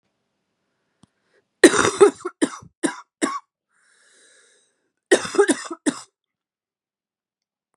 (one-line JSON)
{"cough_length": "7.8 s", "cough_amplitude": 32768, "cough_signal_mean_std_ratio": 0.26, "survey_phase": "beta (2021-08-13 to 2022-03-07)", "age": "45-64", "gender": "Female", "wearing_mask": "No", "symptom_cough_any": true, "symptom_runny_or_blocked_nose": true, "symptom_sore_throat": true, "symptom_fatigue": true, "symptom_headache": true, "symptom_change_to_sense_of_smell_or_taste": true, "symptom_onset": "2 days", "smoker_status": "Never smoked", "respiratory_condition_asthma": true, "respiratory_condition_other": false, "recruitment_source": "Test and Trace", "submission_delay": "1 day", "covid_test_result": "Positive", "covid_test_method": "RT-qPCR", "covid_ct_value": 21.8, "covid_ct_gene": "N gene", "covid_ct_mean": 22.3, "covid_viral_load": "50000 copies/ml", "covid_viral_load_category": "Low viral load (10K-1M copies/ml)"}